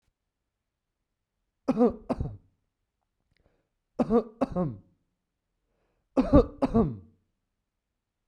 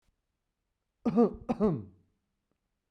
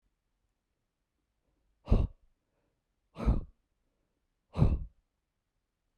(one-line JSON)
{"three_cough_length": "8.3 s", "three_cough_amplitude": 20915, "three_cough_signal_mean_std_ratio": 0.3, "cough_length": "2.9 s", "cough_amplitude": 7657, "cough_signal_mean_std_ratio": 0.33, "exhalation_length": "6.0 s", "exhalation_amplitude": 9945, "exhalation_signal_mean_std_ratio": 0.25, "survey_phase": "beta (2021-08-13 to 2022-03-07)", "age": "18-44", "gender": "Male", "wearing_mask": "No", "symptom_none": true, "smoker_status": "Never smoked", "respiratory_condition_asthma": false, "respiratory_condition_other": false, "recruitment_source": "REACT", "submission_delay": "3 days", "covid_test_result": "Negative", "covid_test_method": "RT-qPCR"}